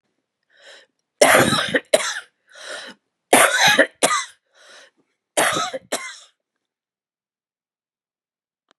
{
  "three_cough_length": "8.8 s",
  "three_cough_amplitude": 32768,
  "three_cough_signal_mean_std_ratio": 0.36,
  "survey_phase": "beta (2021-08-13 to 2022-03-07)",
  "age": "45-64",
  "gender": "Female",
  "wearing_mask": "No",
  "symptom_cough_any": true,
  "symptom_runny_or_blocked_nose": true,
  "symptom_sore_throat": true,
  "symptom_abdominal_pain": true,
  "symptom_fatigue": true,
  "symptom_headache": true,
  "symptom_change_to_sense_of_smell_or_taste": true,
  "symptom_loss_of_taste": true,
  "smoker_status": "Never smoked",
  "respiratory_condition_asthma": true,
  "respiratory_condition_other": false,
  "recruitment_source": "Test and Trace",
  "submission_delay": "6 days",
  "covid_test_result": "Positive",
  "covid_test_method": "LFT"
}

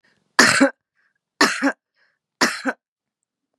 {
  "three_cough_length": "3.6 s",
  "three_cough_amplitude": 32768,
  "three_cough_signal_mean_std_ratio": 0.35,
  "survey_phase": "beta (2021-08-13 to 2022-03-07)",
  "age": "45-64",
  "gender": "Female",
  "wearing_mask": "No",
  "symptom_cough_any": true,
  "symptom_runny_or_blocked_nose": true,
  "symptom_sore_throat": true,
  "symptom_fatigue": true,
  "symptom_change_to_sense_of_smell_or_taste": true,
  "symptom_onset": "3 days",
  "smoker_status": "Never smoked",
  "respiratory_condition_asthma": false,
  "respiratory_condition_other": false,
  "recruitment_source": "Test and Trace",
  "submission_delay": "1 day",
  "covid_test_result": "Positive",
  "covid_test_method": "RT-qPCR",
  "covid_ct_value": 22.1,
  "covid_ct_gene": "N gene"
}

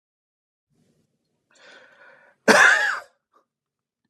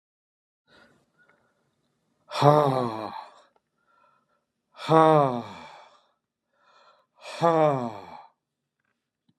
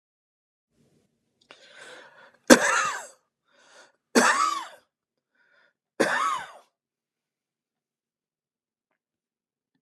{
  "cough_length": "4.1 s",
  "cough_amplitude": 29281,
  "cough_signal_mean_std_ratio": 0.27,
  "exhalation_length": "9.4 s",
  "exhalation_amplitude": 25287,
  "exhalation_signal_mean_std_ratio": 0.3,
  "three_cough_length": "9.8 s",
  "three_cough_amplitude": 32768,
  "three_cough_signal_mean_std_ratio": 0.26,
  "survey_phase": "beta (2021-08-13 to 2022-03-07)",
  "age": "65+",
  "gender": "Male",
  "wearing_mask": "No",
  "symptom_cough_any": true,
  "smoker_status": "Never smoked",
  "respiratory_condition_asthma": false,
  "respiratory_condition_other": true,
  "recruitment_source": "REACT",
  "submission_delay": "2 days",
  "covid_test_result": "Negative",
  "covid_test_method": "RT-qPCR"
}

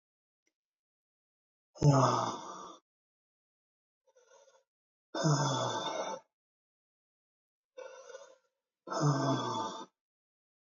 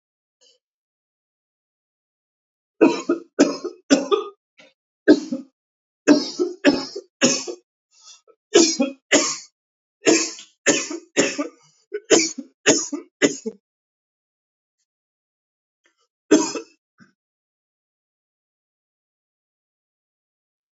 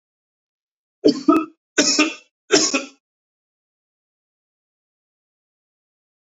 {
  "exhalation_length": "10.7 s",
  "exhalation_amplitude": 6805,
  "exhalation_signal_mean_std_ratio": 0.38,
  "cough_length": "20.7 s",
  "cough_amplitude": 28190,
  "cough_signal_mean_std_ratio": 0.31,
  "three_cough_length": "6.4 s",
  "three_cough_amplitude": 26355,
  "three_cough_signal_mean_std_ratio": 0.28,
  "survey_phase": "alpha (2021-03-01 to 2021-08-12)",
  "age": "45-64",
  "gender": "Male",
  "wearing_mask": "No",
  "symptom_none": true,
  "smoker_status": "Never smoked",
  "respiratory_condition_asthma": false,
  "respiratory_condition_other": false,
  "recruitment_source": "REACT",
  "submission_delay": "1 day",
  "covid_test_result": "Negative",
  "covid_test_method": "RT-qPCR"
}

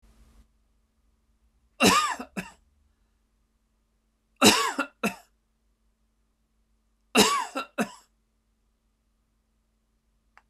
{
  "three_cough_length": "10.5 s",
  "three_cough_amplitude": 23913,
  "three_cough_signal_mean_std_ratio": 0.26,
  "survey_phase": "beta (2021-08-13 to 2022-03-07)",
  "age": "65+",
  "gender": "Male",
  "wearing_mask": "No",
  "symptom_none": true,
  "smoker_status": "Never smoked",
  "respiratory_condition_asthma": false,
  "respiratory_condition_other": false,
  "recruitment_source": "REACT",
  "submission_delay": "5 days",
  "covid_test_result": "Negative",
  "covid_test_method": "RT-qPCR",
  "influenza_a_test_result": "Negative",
  "influenza_b_test_result": "Negative"
}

